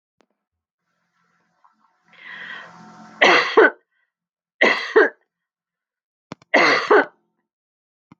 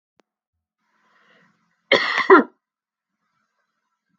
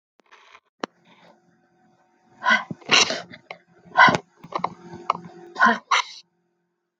{"three_cough_length": "8.2 s", "three_cough_amplitude": 32256, "three_cough_signal_mean_std_ratio": 0.32, "cough_length": "4.2 s", "cough_amplitude": 32766, "cough_signal_mean_std_ratio": 0.22, "exhalation_length": "7.0 s", "exhalation_amplitude": 32768, "exhalation_signal_mean_std_ratio": 0.31, "survey_phase": "beta (2021-08-13 to 2022-03-07)", "age": "45-64", "gender": "Female", "wearing_mask": "No", "symptom_none": true, "symptom_onset": "5 days", "smoker_status": "Never smoked", "respiratory_condition_asthma": false, "respiratory_condition_other": false, "recruitment_source": "REACT", "submission_delay": "2 days", "covid_test_result": "Negative", "covid_test_method": "RT-qPCR"}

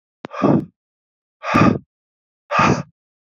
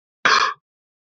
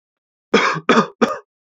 {"exhalation_length": "3.3 s", "exhalation_amplitude": 27121, "exhalation_signal_mean_std_ratio": 0.41, "cough_length": "1.2 s", "cough_amplitude": 28072, "cough_signal_mean_std_ratio": 0.37, "three_cough_length": "1.8 s", "three_cough_amplitude": 30280, "three_cough_signal_mean_std_ratio": 0.43, "survey_phase": "beta (2021-08-13 to 2022-03-07)", "age": "18-44", "gender": "Male", "wearing_mask": "No", "symptom_none": true, "smoker_status": "Never smoked", "respiratory_condition_asthma": false, "respiratory_condition_other": false, "recruitment_source": "REACT", "submission_delay": "1 day", "covid_test_result": "Negative", "covid_test_method": "RT-qPCR"}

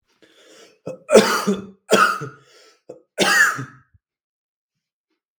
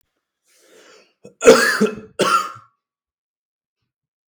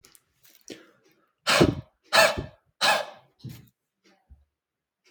{"three_cough_length": "5.4 s", "three_cough_amplitude": 32768, "three_cough_signal_mean_std_ratio": 0.37, "cough_length": "4.3 s", "cough_amplitude": 32768, "cough_signal_mean_std_ratio": 0.31, "exhalation_length": "5.1 s", "exhalation_amplitude": 20952, "exhalation_signal_mean_std_ratio": 0.31, "survey_phase": "beta (2021-08-13 to 2022-03-07)", "age": "18-44", "gender": "Male", "wearing_mask": "No", "symptom_shortness_of_breath": true, "symptom_fatigue": true, "symptom_onset": "3 days", "smoker_status": "Ex-smoker", "respiratory_condition_asthma": true, "respiratory_condition_other": false, "recruitment_source": "Test and Trace", "submission_delay": "3 days", "covid_test_result": "Positive", "covid_test_method": "ePCR"}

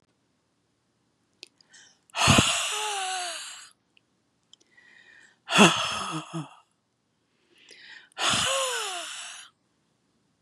{"exhalation_length": "10.4 s", "exhalation_amplitude": 26205, "exhalation_signal_mean_std_ratio": 0.38, "survey_phase": "beta (2021-08-13 to 2022-03-07)", "age": "65+", "gender": "Female", "wearing_mask": "No", "symptom_none": true, "symptom_onset": "12 days", "smoker_status": "Ex-smoker", "respiratory_condition_asthma": false, "respiratory_condition_other": false, "recruitment_source": "REACT", "submission_delay": "1 day", "covid_test_result": "Negative", "covid_test_method": "RT-qPCR", "influenza_a_test_result": "Negative", "influenza_b_test_result": "Negative"}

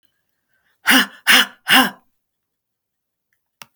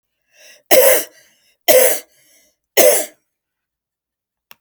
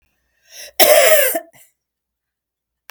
{"exhalation_length": "3.8 s", "exhalation_amplitude": 32768, "exhalation_signal_mean_std_ratio": 0.31, "three_cough_length": "4.6 s", "three_cough_amplitude": 32768, "three_cough_signal_mean_std_ratio": 0.36, "cough_length": "2.9 s", "cough_amplitude": 32768, "cough_signal_mean_std_ratio": 0.37, "survey_phase": "beta (2021-08-13 to 2022-03-07)", "age": "65+", "gender": "Female", "wearing_mask": "No", "symptom_none": true, "smoker_status": "Never smoked", "respiratory_condition_asthma": false, "respiratory_condition_other": false, "recruitment_source": "REACT", "submission_delay": "2 days", "covid_test_result": "Negative", "covid_test_method": "RT-qPCR"}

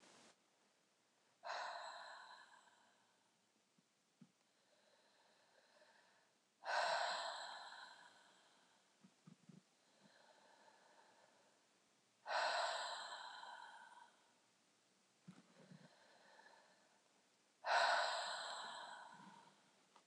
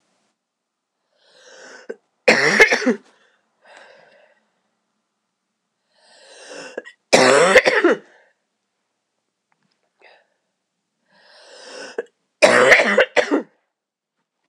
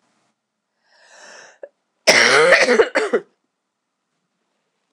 {"exhalation_length": "20.1 s", "exhalation_amplitude": 1880, "exhalation_signal_mean_std_ratio": 0.38, "three_cough_length": "14.5 s", "three_cough_amplitude": 26028, "three_cough_signal_mean_std_ratio": 0.32, "cough_length": "4.9 s", "cough_amplitude": 26028, "cough_signal_mean_std_ratio": 0.37, "survey_phase": "beta (2021-08-13 to 2022-03-07)", "age": "18-44", "gender": "Female", "wearing_mask": "No", "symptom_cough_any": true, "symptom_runny_or_blocked_nose": true, "symptom_shortness_of_breath": true, "symptom_sore_throat": true, "symptom_fatigue": true, "symptom_fever_high_temperature": true, "symptom_headache": true, "symptom_onset": "4 days", "smoker_status": "Never smoked", "respiratory_condition_asthma": false, "respiratory_condition_other": false, "recruitment_source": "Test and Trace", "submission_delay": "2 days", "covid_test_result": "Positive", "covid_test_method": "RT-qPCR", "covid_ct_value": 18.2, "covid_ct_gene": "N gene"}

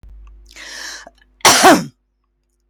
{"cough_length": "2.7 s", "cough_amplitude": 32767, "cough_signal_mean_std_ratio": 0.36, "survey_phase": "beta (2021-08-13 to 2022-03-07)", "age": "65+", "gender": "Female", "wearing_mask": "No", "symptom_none": true, "smoker_status": "Ex-smoker", "respiratory_condition_asthma": false, "respiratory_condition_other": false, "recruitment_source": "REACT", "submission_delay": "2 days", "covid_test_result": "Negative", "covid_test_method": "RT-qPCR", "influenza_a_test_result": "Positive", "influenza_a_ct_value": 31.8, "influenza_b_test_result": "Positive", "influenza_b_ct_value": 32.6}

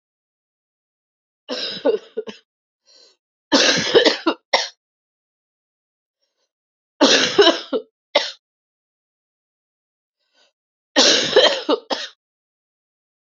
{"three_cough_length": "13.4 s", "three_cough_amplitude": 32768, "three_cough_signal_mean_std_ratio": 0.34, "survey_phase": "alpha (2021-03-01 to 2021-08-12)", "age": "45-64", "gender": "Female", "wearing_mask": "No", "symptom_cough_any": true, "symptom_new_continuous_cough": true, "symptom_shortness_of_breath": true, "symptom_fatigue": true, "symptom_fever_high_temperature": true, "symptom_headache": true, "symptom_change_to_sense_of_smell_or_taste": true, "symptom_onset": "3 days", "smoker_status": "Ex-smoker", "respiratory_condition_asthma": false, "respiratory_condition_other": false, "recruitment_source": "Test and Trace", "submission_delay": "1 day", "covid_test_result": "Positive", "covid_test_method": "RT-qPCR"}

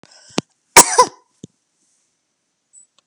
{"cough_length": "3.1 s", "cough_amplitude": 32768, "cough_signal_mean_std_ratio": 0.21, "survey_phase": "alpha (2021-03-01 to 2021-08-12)", "age": "65+", "gender": "Female", "wearing_mask": "No", "symptom_none": true, "smoker_status": "Never smoked", "respiratory_condition_asthma": true, "respiratory_condition_other": false, "recruitment_source": "REACT", "submission_delay": "2 days", "covid_test_result": "Negative", "covid_test_method": "RT-qPCR"}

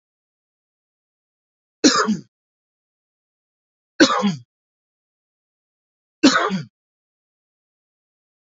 {"three_cough_length": "8.5 s", "three_cough_amplitude": 28809, "three_cough_signal_mean_std_ratio": 0.25, "survey_phase": "beta (2021-08-13 to 2022-03-07)", "age": "45-64", "gender": "Male", "wearing_mask": "No", "symptom_none": true, "smoker_status": "Ex-smoker", "respiratory_condition_asthma": false, "respiratory_condition_other": false, "recruitment_source": "REACT", "submission_delay": "2 days", "covid_test_result": "Negative", "covid_test_method": "RT-qPCR"}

